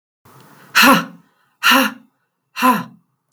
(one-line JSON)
{"exhalation_length": "3.3 s", "exhalation_amplitude": 32768, "exhalation_signal_mean_std_ratio": 0.4, "survey_phase": "beta (2021-08-13 to 2022-03-07)", "age": "45-64", "gender": "Female", "wearing_mask": "No", "symptom_headache": true, "smoker_status": "Ex-smoker", "respiratory_condition_asthma": false, "respiratory_condition_other": false, "recruitment_source": "REACT", "submission_delay": "4 days", "covid_test_result": "Negative", "covid_test_method": "RT-qPCR", "influenza_a_test_result": "Unknown/Void", "influenza_b_test_result": "Unknown/Void"}